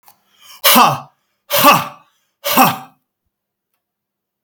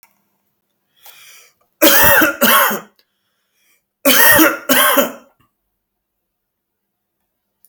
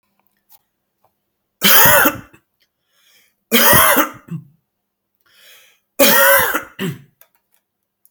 {"exhalation_length": "4.4 s", "exhalation_amplitude": 32768, "exhalation_signal_mean_std_ratio": 0.38, "cough_length": "7.7 s", "cough_amplitude": 32768, "cough_signal_mean_std_ratio": 0.4, "three_cough_length": "8.1 s", "three_cough_amplitude": 32768, "three_cough_signal_mean_std_ratio": 0.39, "survey_phase": "beta (2021-08-13 to 2022-03-07)", "age": "45-64", "gender": "Male", "wearing_mask": "No", "symptom_cough_any": true, "symptom_new_continuous_cough": true, "symptom_onset": "12 days", "smoker_status": "Never smoked", "respiratory_condition_asthma": false, "respiratory_condition_other": false, "recruitment_source": "REACT", "submission_delay": "2 days", "covid_test_result": "Negative", "covid_test_method": "RT-qPCR"}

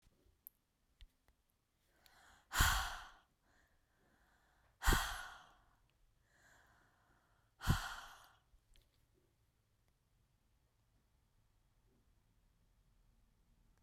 {"exhalation_length": "13.8 s", "exhalation_amplitude": 4889, "exhalation_signal_mean_std_ratio": 0.23, "survey_phase": "beta (2021-08-13 to 2022-03-07)", "age": "18-44", "gender": "Female", "wearing_mask": "No", "symptom_other": true, "smoker_status": "Never smoked", "respiratory_condition_asthma": false, "respiratory_condition_other": false, "recruitment_source": "Test and Trace", "submission_delay": "2 days", "covid_test_result": "Positive", "covid_test_method": "RT-qPCR", "covid_ct_value": 16.8, "covid_ct_gene": "N gene", "covid_ct_mean": 17.8, "covid_viral_load": "1400000 copies/ml", "covid_viral_load_category": "High viral load (>1M copies/ml)"}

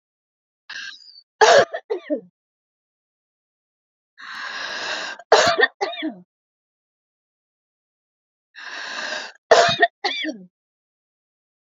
{"three_cough_length": "11.6 s", "three_cough_amplitude": 27981, "three_cough_signal_mean_std_ratio": 0.32, "survey_phase": "beta (2021-08-13 to 2022-03-07)", "age": "45-64", "gender": "Female", "wearing_mask": "No", "symptom_cough_any": true, "symptom_diarrhoea": true, "symptom_fatigue": true, "smoker_status": "Never smoked", "respiratory_condition_asthma": true, "respiratory_condition_other": false, "recruitment_source": "REACT", "submission_delay": "1 day", "covid_test_result": "Negative", "covid_test_method": "RT-qPCR", "influenza_a_test_result": "Negative", "influenza_b_test_result": "Negative"}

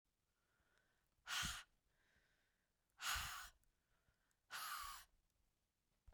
{"exhalation_length": "6.1 s", "exhalation_amplitude": 954, "exhalation_signal_mean_std_ratio": 0.38, "survey_phase": "beta (2021-08-13 to 2022-03-07)", "age": "45-64", "gender": "Female", "wearing_mask": "No", "symptom_sore_throat": true, "symptom_fatigue": true, "symptom_other": true, "smoker_status": "Current smoker (e-cigarettes or vapes only)", "respiratory_condition_asthma": false, "respiratory_condition_other": false, "recruitment_source": "Test and Trace", "submission_delay": "2 days", "covid_test_result": "Positive", "covid_test_method": "RT-qPCR", "covid_ct_value": 16.8, "covid_ct_gene": "ORF1ab gene", "covid_ct_mean": 17.2, "covid_viral_load": "2300000 copies/ml", "covid_viral_load_category": "High viral load (>1M copies/ml)"}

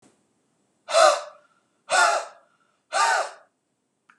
{"exhalation_length": "4.2 s", "exhalation_amplitude": 22802, "exhalation_signal_mean_std_ratio": 0.39, "survey_phase": "beta (2021-08-13 to 2022-03-07)", "age": "65+", "gender": "Male", "wearing_mask": "No", "symptom_none": true, "smoker_status": "Never smoked", "respiratory_condition_asthma": false, "respiratory_condition_other": false, "recruitment_source": "REACT", "submission_delay": "2 days", "covid_test_result": "Negative", "covid_test_method": "RT-qPCR", "influenza_a_test_result": "Negative", "influenza_b_test_result": "Negative"}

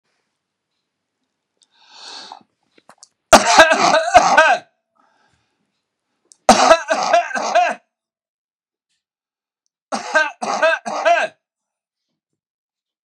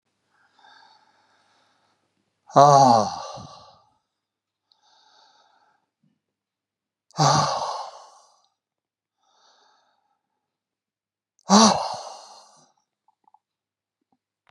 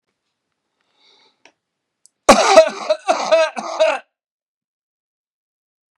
{"three_cough_length": "13.1 s", "three_cough_amplitude": 32768, "three_cough_signal_mean_std_ratio": 0.37, "exhalation_length": "14.5 s", "exhalation_amplitude": 28761, "exhalation_signal_mean_std_ratio": 0.25, "cough_length": "6.0 s", "cough_amplitude": 32768, "cough_signal_mean_std_ratio": 0.32, "survey_phase": "beta (2021-08-13 to 2022-03-07)", "age": "65+", "gender": "Male", "wearing_mask": "No", "symptom_none": true, "smoker_status": "Ex-smoker", "respiratory_condition_asthma": false, "respiratory_condition_other": false, "recruitment_source": "REACT", "submission_delay": "1 day", "covid_test_result": "Negative", "covid_test_method": "RT-qPCR", "influenza_a_test_result": "Negative", "influenza_b_test_result": "Negative"}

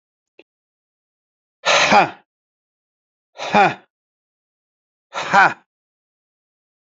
{"exhalation_length": "6.8 s", "exhalation_amplitude": 28041, "exhalation_signal_mean_std_ratio": 0.29, "survey_phase": "beta (2021-08-13 to 2022-03-07)", "age": "45-64", "gender": "Male", "wearing_mask": "No", "symptom_cough_any": true, "symptom_shortness_of_breath": true, "symptom_fatigue": true, "symptom_fever_high_temperature": true, "symptom_headache": true, "symptom_change_to_sense_of_smell_or_taste": true, "symptom_loss_of_taste": true, "symptom_onset": "8 days", "smoker_status": "Ex-smoker", "respiratory_condition_asthma": false, "respiratory_condition_other": false, "recruitment_source": "Test and Trace", "submission_delay": "1 day", "covid_test_result": "Positive", "covid_test_method": "RT-qPCR"}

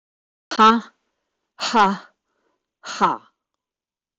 {"exhalation_length": "4.2 s", "exhalation_amplitude": 15670, "exhalation_signal_mean_std_ratio": 0.34, "survey_phase": "beta (2021-08-13 to 2022-03-07)", "age": "65+", "gender": "Female", "wearing_mask": "No", "symptom_none": true, "smoker_status": "Never smoked", "respiratory_condition_asthma": true, "respiratory_condition_other": false, "recruitment_source": "REACT", "submission_delay": "7 days", "covid_test_result": "Negative", "covid_test_method": "RT-qPCR", "influenza_a_test_result": "Negative", "influenza_b_test_result": "Negative"}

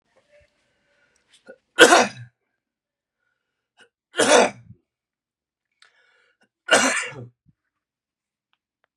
{"three_cough_length": "9.0 s", "three_cough_amplitude": 32768, "three_cough_signal_mean_std_ratio": 0.24, "survey_phase": "beta (2021-08-13 to 2022-03-07)", "age": "45-64", "gender": "Male", "wearing_mask": "No", "symptom_cough_any": true, "symptom_new_continuous_cough": true, "symptom_runny_or_blocked_nose": true, "symptom_headache": true, "smoker_status": "Never smoked", "respiratory_condition_asthma": false, "respiratory_condition_other": false, "recruitment_source": "Test and Trace", "submission_delay": "1 day", "covid_test_result": "Positive", "covid_test_method": "RT-qPCR", "covid_ct_value": 27.7, "covid_ct_gene": "N gene"}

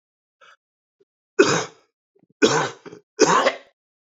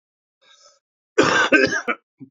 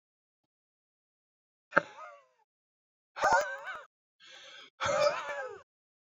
{"three_cough_length": "4.0 s", "three_cough_amplitude": 26817, "three_cough_signal_mean_std_ratio": 0.35, "cough_length": "2.3 s", "cough_amplitude": 26535, "cough_signal_mean_std_ratio": 0.43, "exhalation_length": "6.1 s", "exhalation_amplitude": 20351, "exhalation_signal_mean_std_ratio": 0.33, "survey_phase": "beta (2021-08-13 to 2022-03-07)", "age": "18-44", "gender": "Male", "wearing_mask": "Yes", "symptom_cough_any": true, "symptom_new_continuous_cough": true, "symptom_runny_or_blocked_nose": true, "symptom_fatigue": true, "symptom_fever_high_temperature": true, "symptom_change_to_sense_of_smell_or_taste": true, "symptom_onset": "3 days", "smoker_status": "Never smoked", "respiratory_condition_asthma": false, "respiratory_condition_other": false, "recruitment_source": "Test and Trace", "submission_delay": "2 days", "covid_test_result": "Positive", "covid_test_method": "RT-qPCR", "covid_ct_value": 18.7, "covid_ct_gene": "ORF1ab gene", "covid_ct_mean": 18.8, "covid_viral_load": "700000 copies/ml", "covid_viral_load_category": "Low viral load (10K-1M copies/ml)"}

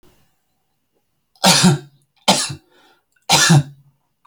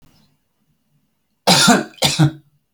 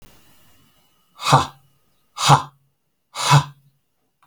{"three_cough_length": "4.3 s", "three_cough_amplitude": 32768, "three_cough_signal_mean_std_ratio": 0.38, "cough_length": "2.7 s", "cough_amplitude": 31474, "cough_signal_mean_std_ratio": 0.39, "exhalation_length": "4.3 s", "exhalation_amplitude": 31462, "exhalation_signal_mean_std_ratio": 0.3, "survey_phase": "alpha (2021-03-01 to 2021-08-12)", "age": "18-44", "gender": "Male", "wearing_mask": "No", "symptom_none": true, "smoker_status": "Never smoked", "respiratory_condition_asthma": false, "respiratory_condition_other": false, "recruitment_source": "REACT", "submission_delay": "1 day", "covid_test_result": "Negative", "covid_test_method": "RT-qPCR"}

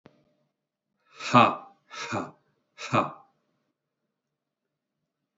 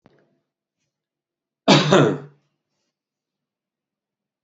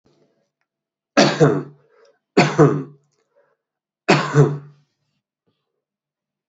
{"exhalation_length": "5.4 s", "exhalation_amplitude": 23023, "exhalation_signal_mean_std_ratio": 0.24, "cough_length": "4.4 s", "cough_amplitude": 32768, "cough_signal_mean_std_ratio": 0.25, "three_cough_length": "6.5 s", "three_cough_amplitude": 30200, "three_cough_signal_mean_std_ratio": 0.33, "survey_phase": "beta (2021-08-13 to 2022-03-07)", "age": "45-64", "gender": "Male", "wearing_mask": "No", "symptom_runny_or_blocked_nose": true, "symptom_fatigue": true, "symptom_headache": true, "symptom_onset": "2 days", "smoker_status": "Ex-smoker", "respiratory_condition_asthma": false, "respiratory_condition_other": false, "recruitment_source": "Test and Trace", "submission_delay": "0 days", "covid_test_result": "Positive", "covid_test_method": "RT-qPCR", "covid_ct_value": 19.4, "covid_ct_gene": "ORF1ab gene"}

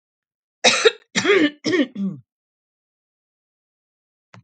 {"cough_length": "4.4 s", "cough_amplitude": 32768, "cough_signal_mean_std_ratio": 0.36, "survey_phase": "alpha (2021-03-01 to 2021-08-12)", "age": "45-64", "gender": "Female", "wearing_mask": "No", "symptom_none": true, "smoker_status": "Never smoked", "respiratory_condition_asthma": false, "respiratory_condition_other": false, "recruitment_source": "REACT", "submission_delay": "1 day", "covid_test_result": "Negative", "covid_test_method": "RT-qPCR"}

